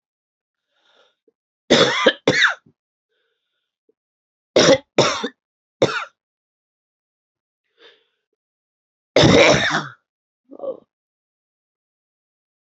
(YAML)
three_cough_length: 12.7 s
three_cough_amplitude: 32767
three_cough_signal_mean_std_ratio: 0.3
survey_phase: beta (2021-08-13 to 2022-03-07)
age: 45-64
gender: Female
wearing_mask: 'No'
symptom_cough_any: true
symptom_runny_or_blocked_nose: true
symptom_shortness_of_breath: true
symptom_sore_throat: true
symptom_fatigue: true
symptom_headache: true
symptom_other: true
smoker_status: Never smoked
respiratory_condition_asthma: false
respiratory_condition_other: false
recruitment_source: Test and Trace
submission_delay: -5 days
covid_test_result: Positive
covid_test_method: LFT